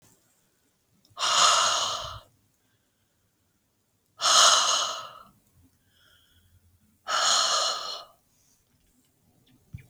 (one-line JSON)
{"exhalation_length": "9.9 s", "exhalation_amplitude": 19444, "exhalation_signal_mean_std_ratio": 0.4, "survey_phase": "beta (2021-08-13 to 2022-03-07)", "age": "18-44", "gender": "Female", "wearing_mask": "No", "symptom_none": true, "smoker_status": "Never smoked", "respiratory_condition_asthma": false, "respiratory_condition_other": false, "recruitment_source": "REACT", "submission_delay": "1 day", "covid_test_result": "Negative", "covid_test_method": "RT-qPCR"}